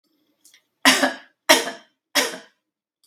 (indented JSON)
{
  "three_cough_length": "3.1 s",
  "three_cough_amplitude": 32768,
  "three_cough_signal_mean_std_ratio": 0.33,
  "survey_phase": "beta (2021-08-13 to 2022-03-07)",
  "age": "45-64",
  "gender": "Female",
  "wearing_mask": "No",
  "symptom_none": true,
  "smoker_status": "Never smoked",
  "respiratory_condition_asthma": false,
  "respiratory_condition_other": false,
  "recruitment_source": "REACT",
  "submission_delay": "6 days",
  "covid_test_result": "Negative",
  "covid_test_method": "RT-qPCR"
}